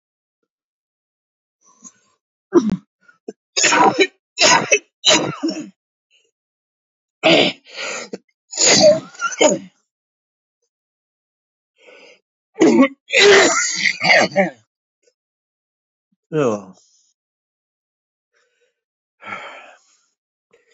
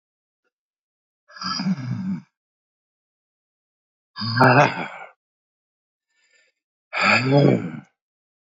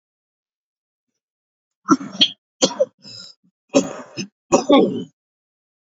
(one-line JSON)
{"three_cough_length": "20.7 s", "three_cough_amplitude": 32767, "three_cough_signal_mean_std_ratio": 0.37, "exhalation_length": "8.5 s", "exhalation_amplitude": 27660, "exhalation_signal_mean_std_ratio": 0.37, "cough_length": "5.9 s", "cough_amplitude": 29796, "cough_signal_mean_std_ratio": 0.31, "survey_phase": "beta (2021-08-13 to 2022-03-07)", "age": "65+", "gender": "Male", "wearing_mask": "No", "symptom_cough_any": true, "symptom_runny_or_blocked_nose": true, "symptom_shortness_of_breath": true, "symptom_abdominal_pain": true, "symptom_diarrhoea": true, "symptom_fatigue": true, "symptom_change_to_sense_of_smell_or_taste": true, "symptom_loss_of_taste": true, "symptom_onset": "7 days", "smoker_status": "Ex-smoker", "respiratory_condition_asthma": false, "respiratory_condition_other": false, "recruitment_source": "Test and Trace", "submission_delay": "2 days", "covid_test_result": "Positive", "covid_test_method": "RT-qPCR", "covid_ct_value": 18.4, "covid_ct_gene": "ORF1ab gene", "covid_ct_mean": 18.6, "covid_viral_load": "780000 copies/ml", "covid_viral_load_category": "Low viral load (10K-1M copies/ml)"}